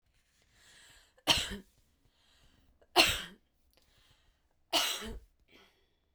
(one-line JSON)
{"three_cough_length": "6.1 s", "three_cough_amplitude": 14878, "three_cough_signal_mean_std_ratio": 0.28, "survey_phase": "beta (2021-08-13 to 2022-03-07)", "age": "45-64", "gender": "Female", "wearing_mask": "No", "symptom_none": true, "smoker_status": "Never smoked", "respiratory_condition_asthma": false, "respiratory_condition_other": false, "recruitment_source": "Test and Trace", "submission_delay": "0 days", "covid_test_result": "Negative", "covid_test_method": "LFT"}